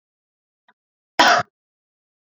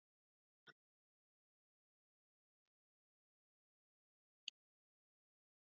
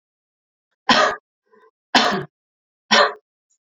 {"cough_length": "2.2 s", "cough_amplitude": 31552, "cough_signal_mean_std_ratio": 0.25, "exhalation_length": "5.7 s", "exhalation_amplitude": 1174, "exhalation_signal_mean_std_ratio": 0.04, "three_cough_length": "3.8 s", "three_cough_amplitude": 31327, "three_cough_signal_mean_std_ratio": 0.34, "survey_phase": "beta (2021-08-13 to 2022-03-07)", "age": "18-44", "gender": "Female", "wearing_mask": "No", "symptom_runny_or_blocked_nose": true, "symptom_fatigue": true, "symptom_onset": "6 days", "smoker_status": "Never smoked", "respiratory_condition_asthma": false, "respiratory_condition_other": false, "recruitment_source": "Test and Trace", "submission_delay": "2 days", "covid_test_result": "Positive", "covid_test_method": "RT-qPCR", "covid_ct_value": 29.6, "covid_ct_gene": "N gene", "covid_ct_mean": 30.6, "covid_viral_load": "95 copies/ml", "covid_viral_load_category": "Minimal viral load (< 10K copies/ml)"}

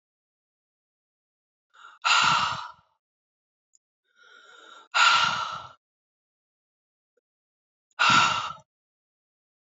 {"exhalation_length": "9.7 s", "exhalation_amplitude": 15822, "exhalation_signal_mean_std_ratio": 0.33, "survey_phase": "beta (2021-08-13 to 2022-03-07)", "age": "45-64", "gender": "Female", "wearing_mask": "No", "symptom_new_continuous_cough": true, "symptom_runny_or_blocked_nose": true, "symptom_sore_throat": true, "symptom_fatigue": true, "symptom_headache": true, "smoker_status": "Never smoked", "respiratory_condition_asthma": false, "respiratory_condition_other": false, "recruitment_source": "Test and Trace", "submission_delay": "2 days", "covid_test_result": "Positive", "covid_test_method": "LFT"}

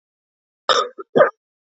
{"cough_length": "1.8 s", "cough_amplitude": 27487, "cough_signal_mean_std_ratio": 0.32, "survey_phase": "beta (2021-08-13 to 2022-03-07)", "age": "18-44", "gender": "Female", "wearing_mask": "No", "symptom_cough_any": true, "symptom_fatigue": true, "symptom_fever_high_temperature": true, "symptom_headache": true, "symptom_change_to_sense_of_smell_or_taste": true, "symptom_onset": "2 days", "smoker_status": "Never smoked", "respiratory_condition_asthma": true, "respiratory_condition_other": false, "recruitment_source": "Test and Trace", "submission_delay": "2 days", "covid_test_result": "Positive", "covid_test_method": "RT-qPCR", "covid_ct_value": 17.2, "covid_ct_gene": "N gene"}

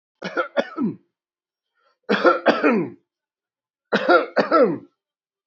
{"three_cough_length": "5.5 s", "three_cough_amplitude": 26979, "three_cough_signal_mean_std_ratio": 0.43, "survey_phase": "beta (2021-08-13 to 2022-03-07)", "age": "18-44", "gender": "Male", "wearing_mask": "No", "symptom_none": true, "smoker_status": "Ex-smoker", "respiratory_condition_asthma": false, "respiratory_condition_other": false, "recruitment_source": "REACT", "submission_delay": "3 days", "covid_test_result": "Negative", "covid_test_method": "RT-qPCR"}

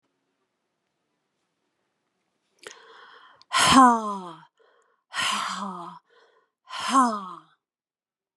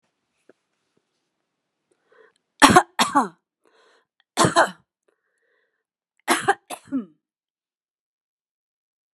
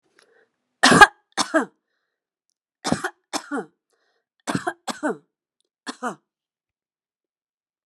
{"exhalation_length": "8.4 s", "exhalation_amplitude": 22437, "exhalation_signal_mean_std_ratio": 0.31, "three_cough_length": "9.1 s", "three_cough_amplitude": 32768, "three_cough_signal_mean_std_ratio": 0.23, "cough_length": "7.9 s", "cough_amplitude": 32768, "cough_signal_mean_std_ratio": 0.23, "survey_phase": "beta (2021-08-13 to 2022-03-07)", "age": "65+", "gender": "Female", "wearing_mask": "No", "symptom_none": true, "smoker_status": "Ex-smoker", "respiratory_condition_asthma": true, "respiratory_condition_other": false, "recruitment_source": "REACT", "submission_delay": "2 days", "covid_test_result": "Negative", "covid_test_method": "RT-qPCR"}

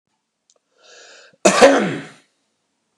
{"cough_length": "3.0 s", "cough_amplitude": 32768, "cough_signal_mean_std_ratio": 0.31, "survey_phase": "beta (2021-08-13 to 2022-03-07)", "age": "45-64", "gender": "Male", "wearing_mask": "No", "symptom_none": true, "smoker_status": "Never smoked", "respiratory_condition_asthma": false, "respiratory_condition_other": false, "recruitment_source": "REACT", "submission_delay": "5 days", "covid_test_result": "Negative", "covid_test_method": "RT-qPCR", "influenza_a_test_result": "Negative", "influenza_b_test_result": "Negative"}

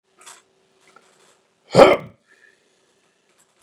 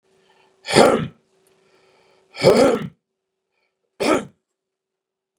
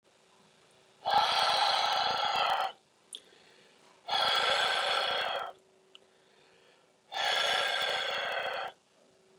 {"cough_length": "3.6 s", "cough_amplitude": 32768, "cough_signal_mean_std_ratio": 0.19, "three_cough_length": "5.4 s", "three_cough_amplitude": 32768, "three_cough_signal_mean_std_ratio": 0.32, "exhalation_length": "9.4 s", "exhalation_amplitude": 6745, "exhalation_signal_mean_std_ratio": 0.62, "survey_phase": "beta (2021-08-13 to 2022-03-07)", "age": "65+", "gender": "Male", "wearing_mask": "No", "symptom_none": true, "smoker_status": "Never smoked", "respiratory_condition_asthma": false, "respiratory_condition_other": false, "recruitment_source": "REACT", "submission_delay": "2 days", "covid_test_result": "Negative", "covid_test_method": "RT-qPCR", "influenza_a_test_result": "Negative", "influenza_b_test_result": "Negative"}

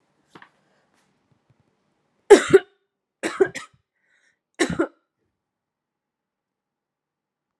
{"three_cough_length": "7.6 s", "three_cough_amplitude": 32767, "three_cough_signal_mean_std_ratio": 0.17, "survey_phase": "alpha (2021-03-01 to 2021-08-12)", "age": "18-44", "gender": "Female", "wearing_mask": "Yes", "symptom_none": true, "smoker_status": "Never smoked", "respiratory_condition_asthma": false, "respiratory_condition_other": false, "recruitment_source": "Test and Trace", "submission_delay": "0 days", "covid_test_result": "Negative", "covid_test_method": "LFT"}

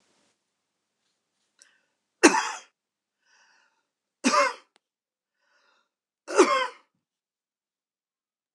{"three_cough_length": "8.5 s", "three_cough_amplitude": 26028, "three_cough_signal_mean_std_ratio": 0.23, "survey_phase": "beta (2021-08-13 to 2022-03-07)", "age": "65+", "gender": "Male", "wearing_mask": "No", "symptom_cough_any": true, "smoker_status": "Never smoked", "respiratory_condition_asthma": false, "respiratory_condition_other": false, "recruitment_source": "REACT", "submission_delay": "2 days", "covid_test_result": "Negative", "covid_test_method": "RT-qPCR", "influenza_a_test_result": "Negative", "influenza_b_test_result": "Negative"}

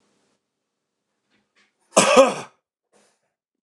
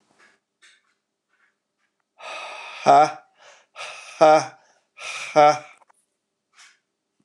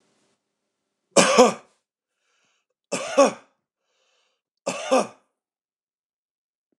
{"cough_length": "3.6 s", "cough_amplitude": 29204, "cough_signal_mean_std_ratio": 0.25, "exhalation_length": "7.2 s", "exhalation_amplitude": 25652, "exhalation_signal_mean_std_ratio": 0.28, "three_cough_length": "6.8 s", "three_cough_amplitude": 29203, "three_cough_signal_mean_std_ratio": 0.27, "survey_phase": "beta (2021-08-13 to 2022-03-07)", "age": "45-64", "gender": "Male", "wearing_mask": "No", "symptom_none": true, "smoker_status": "Never smoked", "respiratory_condition_asthma": true, "respiratory_condition_other": false, "recruitment_source": "REACT", "submission_delay": "5 days", "covid_test_result": "Negative", "covid_test_method": "RT-qPCR"}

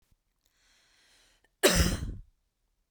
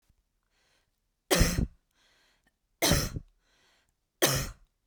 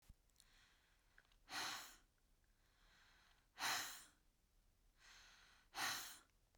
{"cough_length": "2.9 s", "cough_amplitude": 12396, "cough_signal_mean_std_ratio": 0.3, "three_cough_length": "4.9 s", "three_cough_amplitude": 13224, "three_cough_signal_mean_std_ratio": 0.34, "exhalation_length": "6.6 s", "exhalation_amplitude": 897, "exhalation_signal_mean_std_ratio": 0.4, "survey_phase": "beta (2021-08-13 to 2022-03-07)", "age": "45-64", "gender": "Female", "wearing_mask": "No", "symptom_none": true, "smoker_status": "Never smoked", "respiratory_condition_asthma": true, "respiratory_condition_other": false, "recruitment_source": "REACT", "submission_delay": "2 days", "covid_test_result": "Negative", "covid_test_method": "RT-qPCR", "influenza_a_test_result": "Negative", "influenza_b_test_result": "Negative"}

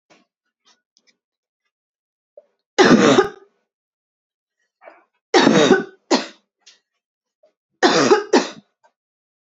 {"three_cough_length": "9.5 s", "three_cough_amplitude": 32708, "three_cough_signal_mean_std_ratio": 0.33, "survey_phase": "beta (2021-08-13 to 2022-03-07)", "age": "18-44", "gender": "Female", "wearing_mask": "No", "symptom_cough_any": true, "symptom_onset": "2 days", "smoker_status": "Never smoked", "respiratory_condition_asthma": false, "respiratory_condition_other": false, "recruitment_source": "REACT", "submission_delay": "1 day", "covid_test_result": "Negative", "covid_test_method": "RT-qPCR", "influenza_a_test_result": "Negative", "influenza_b_test_result": "Negative"}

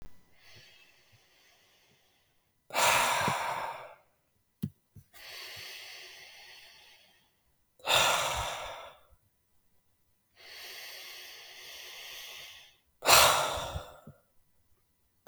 {"exhalation_length": "15.3 s", "exhalation_amplitude": 19676, "exhalation_signal_mean_std_ratio": 0.36, "survey_phase": "beta (2021-08-13 to 2022-03-07)", "age": "18-44", "gender": "Male", "wearing_mask": "No", "symptom_cough_any": true, "symptom_new_continuous_cough": true, "symptom_runny_or_blocked_nose": true, "symptom_fever_high_temperature": true, "smoker_status": "Never smoked", "respiratory_condition_asthma": false, "respiratory_condition_other": false, "recruitment_source": "Test and Trace", "submission_delay": "1 day", "covid_test_result": "Positive", "covid_test_method": "LAMP"}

